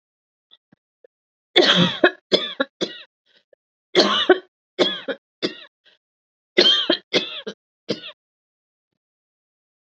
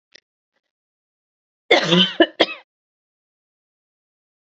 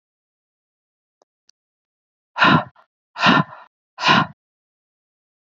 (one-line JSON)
{"three_cough_length": "9.9 s", "three_cough_amplitude": 31199, "three_cough_signal_mean_std_ratio": 0.34, "cough_length": "4.5 s", "cough_amplitude": 32768, "cough_signal_mean_std_ratio": 0.25, "exhalation_length": "5.5 s", "exhalation_amplitude": 27472, "exhalation_signal_mean_std_ratio": 0.29, "survey_phase": "beta (2021-08-13 to 2022-03-07)", "age": "45-64", "gender": "Female", "wearing_mask": "No", "symptom_cough_any": true, "symptom_runny_or_blocked_nose": true, "smoker_status": "Never smoked", "respiratory_condition_asthma": false, "respiratory_condition_other": false, "recruitment_source": "REACT", "submission_delay": "1 day", "covid_test_result": "Negative", "covid_test_method": "RT-qPCR", "influenza_a_test_result": "Unknown/Void", "influenza_b_test_result": "Unknown/Void"}